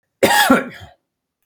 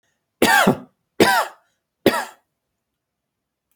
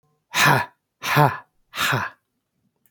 {
  "cough_length": "1.5 s",
  "cough_amplitude": 28767,
  "cough_signal_mean_std_ratio": 0.45,
  "three_cough_length": "3.8 s",
  "three_cough_amplitude": 29078,
  "three_cough_signal_mean_std_ratio": 0.35,
  "exhalation_length": "2.9 s",
  "exhalation_amplitude": 28347,
  "exhalation_signal_mean_std_ratio": 0.43,
  "survey_phase": "alpha (2021-03-01 to 2021-08-12)",
  "age": "45-64",
  "gender": "Male",
  "wearing_mask": "No",
  "symptom_none": true,
  "smoker_status": "Never smoked",
  "respiratory_condition_asthma": true,
  "respiratory_condition_other": false,
  "recruitment_source": "REACT",
  "submission_delay": "1 day",
  "covid_test_result": "Negative",
  "covid_test_method": "RT-qPCR"
}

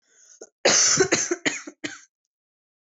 {
  "cough_length": "3.0 s",
  "cough_amplitude": 16541,
  "cough_signal_mean_std_ratio": 0.42,
  "survey_phase": "beta (2021-08-13 to 2022-03-07)",
  "age": "18-44",
  "gender": "Female",
  "wearing_mask": "No",
  "symptom_runny_or_blocked_nose": true,
  "symptom_fatigue": true,
  "symptom_headache": true,
  "symptom_other": true,
  "smoker_status": "Never smoked",
  "respiratory_condition_asthma": false,
  "respiratory_condition_other": false,
  "recruitment_source": "Test and Trace",
  "submission_delay": "2 days",
  "covid_test_result": "Positive",
  "covid_test_method": "RT-qPCR",
  "covid_ct_value": 19.5,
  "covid_ct_gene": "ORF1ab gene",
  "covid_ct_mean": 19.9,
  "covid_viral_load": "300000 copies/ml",
  "covid_viral_load_category": "Low viral load (10K-1M copies/ml)"
}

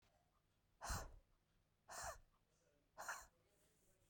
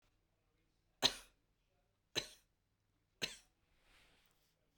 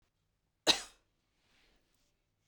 {
  "exhalation_length": "4.1 s",
  "exhalation_amplitude": 733,
  "exhalation_signal_mean_std_ratio": 0.4,
  "three_cough_length": "4.8 s",
  "three_cough_amplitude": 4921,
  "three_cough_signal_mean_std_ratio": 0.18,
  "cough_length": "2.5 s",
  "cough_amplitude": 9541,
  "cough_signal_mean_std_ratio": 0.16,
  "survey_phase": "beta (2021-08-13 to 2022-03-07)",
  "age": "18-44",
  "gender": "Female",
  "wearing_mask": "No",
  "symptom_none": true,
  "smoker_status": "Current smoker (1 to 10 cigarettes per day)",
  "respiratory_condition_asthma": true,
  "respiratory_condition_other": false,
  "recruitment_source": "REACT",
  "submission_delay": "2 days",
  "covid_test_result": "Negative",
  "covid_test_method": "RT-qPCR"
}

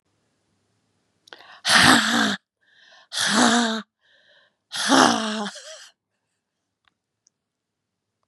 {
  "exhalation_length": "8.3 s",
  "exhalation_amplitude": 31973,
  "exhalation_signal_mean_std_ratio": 0.38,
  "survey_phase": "beta (2021-08-13 to 2022-03-07)",
  "age": "45-64",
  "gender": "Female",
  "wearing_mask": "No",
  "symptom_none": true,
  "smoker_status": "Never smoked",
  "respiratory_condition_asthma": false,
  "respiratory_condition_other": false,
  "recruitment_source": "REACT",
  "submission_delay": "2 days",
  "covid_test_result": "Negative",
  "covid_test_method": "RT-qPCR",
  "influenza_a_test_result": "Negative",
  "influenza_b_test_result": "Negative"
}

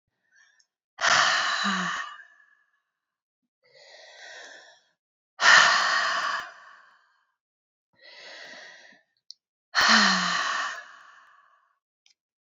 {
  "exhalation_length": "12.5 s",
  "exhalation_amplitude": 21179,
  "exhalation_signal_mean_std_ratio": 0.39,
  "survey_phase": "beta (2021-08-13 to 2022-03-07)",
  "age": "18-44",
  "gender": "Female",
  "wearing_mask": "No",
  "symptom_runny_or_blocked_nose": true,
  "symptom_sore_throat": true,
  "symptom_fatigue": true,
  "symptom_change_to_sense_of_smell_or_taste": true,
  "symptom_other": true,
  "smoker_status": "Never smoked",
  "respiratory_condition_asthma": false,
  "respiratory_condition_other": false,
  "recruitment_source": "Test and Trace",
  "submission_delay": "2 days",
  "covid_test_result": "Positive",
  "covid_test_method": "RT-qPCR",
  "covid_ct_value": 16.9,
  "covid_ct_gene": "ORF1ab gene",
  "covid_ct_mean": 17.5,
  "covid_viral_load": "1800000 copies/ml",
  "covid_viral_load_category": "High viral load (>1M copies/ml)"
}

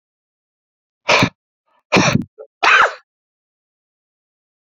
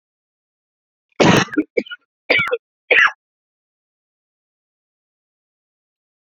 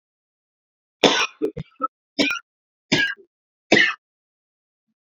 {
  "exhalation_length": "4.6 s",
  "exhalation_amplitude": 31621,
  "exhalation_signal_mean_std_ratio": 0.33,
  "cough_length": "6.3 s",
  "cough_amplitude": 30444,
  "cough_signal_mean_std_ratio": 0.28,
  "three_cough_length": "5.0 s",
  "three_cough_amplitude": 32768,
  "three_cough_signal_mean_std_ratio": 0.33,
  "survey_phase": "beta (2021-08-13 to 2022-03-07)",
  "age": "18-44",
  "gender": "Male",
  "wearing_mask": "No",
  "symptom_cough_any": true,
  "symptom_runny_or_blocked_nose": true,
  "symptom_shortness_of_breath": true,
  "symptom_fatigue": true,
  "symptom_fever_high_temperature": true,
  "symptom_headache": true,
  "smoker_status": "Ex-smoker",
  "respiratory_condition_asthma": true,
  "respiratory_condition_other": false,
  "recruitment_source": "Test and Trace",
  "submission_delay": "3 days",
  "covid_test_result": "Positive",
  "covid_test_method": "RT-qPCR",
  "covid_ct_value": 24.6,
  "covid_ct_gene": "S gene"
}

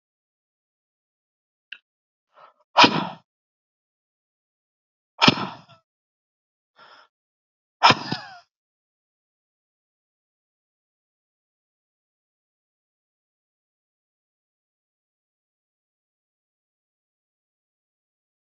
{
  "exhalation_length": "18.4 s",
  "exhalation_amplitude": 30469,
  "exhalation_signal_mean_std_ratio": 0.13,
  "survey_phase": "alpha (2021-03-01 to 2021-08-12)",
  "age": "65+",
  "gender": "Male",
  "wearing_mask": "No",
  "symptom_none": true,
  "smoker_status": "Ex-smoker",
  "respiratory_condition_asthma": false,
  "respiratory_condition_other": false,
  "recruitment_source": "REACT",
  "submission_delay": "-1 day",
  "covid_test_result": "Negative",
  "covid_test_method": "RT-qPCR"
}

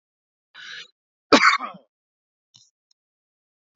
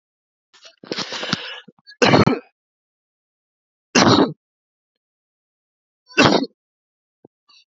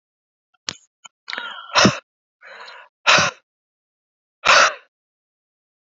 {
  "cough_length": "3.8 s",
  "cough_amplitude": 27596,
  "cough_signal_mean_std_ratio": 0.22,
  "three_cough_length": "7.8 s",
  "three_cough_amplitude": 32768,
  "three_cough_signal_mean_std_ratio": 0.3,
  "exhalation_length": "5.8 s",
  "exhalation_amplitude": 32476,
  "exhalation_signal_mean_std_ratio": 0.3,
  "survey_phase": "beta (2021-08-13 to 2022-03-07)",
  "age": "18-44",
  "gender": "Male",
  "wearing_mask": "No",
  "symptom_abdominal_pain": true,
  "symptom_fatigue": true,
  "symptom_headache": true,
  "symptom_onset": "12 days",
  "smoker_status": "Never smoked",
  "respiratory_condition_asthma": false,
  "respiratory_condition_other": false,
  "recruitment_source": "REACT",
  "submission_delay": "1 day",
  "covid_test_result": "Negative",
  "covid_test_method": "RT-qPCR"
}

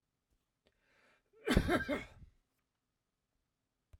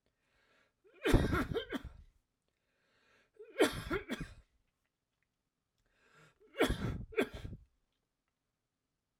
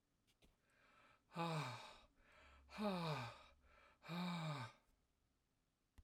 {
  "cough_length": "4.0 s",
  "cough_amplitude": 6094,
  "cough_signal_mean_std_ratio": 0.27,
  "three_cough_length": "9.2 s",
  "three_cough_amplitude": 6972,
  "three_cough_signal_mean_std_ratio": 0.32,
  "exhalation_length": "6.0 s",
  "exhalation_amplitude": 784,
  "exhalation_signal_mean_std_ratio": 0.5,
  "survey_phase": "alpha (2021-03-01 to 2021-08-12)",
  "age": "65+",
  "gender": "Male",
  "wearing_mask": "No",
  "symptom_none": true,
  "smoker_status": "Never smoked",
  "respiratory_condition_asthma": false,
  "respiratory_condition_other": false,
  "recruitment_source": "REACT",
  "submission_delay": "2 days",
  "covid_test_result": "Negative",
  "covid_test_method": "RT-qPCR"
}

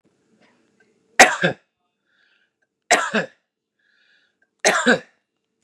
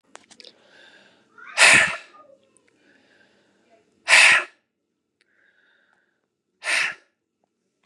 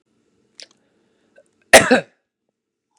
{
  "three_cough_length": "5.6 s",
  "three_cough_amplitude": 32768,
  "three_cough_signal_mean_std_ratio": 0.27,
  "exhalation_length": "7.9 s",
  "exhalation_amplitude": 32133,
  "exhalation_signal_mean_std_ratio": 0.27,
  "cough_length": "3.0 s",
  "cough_amplitude": 32768,
  "cough_signal_mean_std_ratio": 0.2,
  "survey_phase": "beta (2021-08-13 to 2022-03-07)",
  "age": "18-44",
  "gender": "Male",
  "wearing_mask": "No",
  "symptom_none": true,
  "symptom_onset": "5 days",
  "smoker_status": "Never smoked",
  "respiratory_condition_asthma": false,
  "respiratory_condition_other": false,
  "recruitment_source": "Test and Trace",
  "submission_delay": "1 day",
  "covid_test_result": "Positive",
  "covid_test_method": "RT-qPCR",
  "covid_ct_value": 17.4,
  "covid_ct_gene": "ORF1ab gene",
  "covid_ct_mean": 17.6,
  "covid_viral_load": "1600000 copies/ml",
  "covid_viral_load_category": "High viral load (>1M copies/ml)"
}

